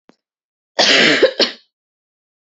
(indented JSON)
{
  "cough_length": "2.5 s",
  "cough_amplitude": 32022,
  "cough_signal_mean_std_ratio": 0.41,
  "survey_phase": "beta (2021-08-13 to 2022-03-07)",
  "age": "18-44",
  "gender": "Female",
  "wearing_mask": "No",
  "symptom_cough_any": true,
  "symptom_runny_or_blocked_nose": true,
  "symptom_shortness_of_breath": true,
  "symptom_sore_throat": true,
  "symptom_abdominal_pain": true,
  "symptom_diarrhoea": true,
  "symptom_fatigue": true,
  "symptom_fever_high_temperature": true,
  "symptom_headache": true,
  "symptom_change_to_sense_of_smell_or_taste": true,
  "symptom_onset": "13 days",
  "smoker_status": "Never smoked",
  "respiratory_condition_asthma": true,
  "respiratory_condition_other": false,
  "recruitment_source": "Test and Trace",
  "submission_delay": "1 day",
  "covid_test_result": "Positive",
  "covid_test_method": "RT-qPCR",
  "covid_ct_value": 28.4,
  "covid_ct_gene": "ORF1ab gene"
}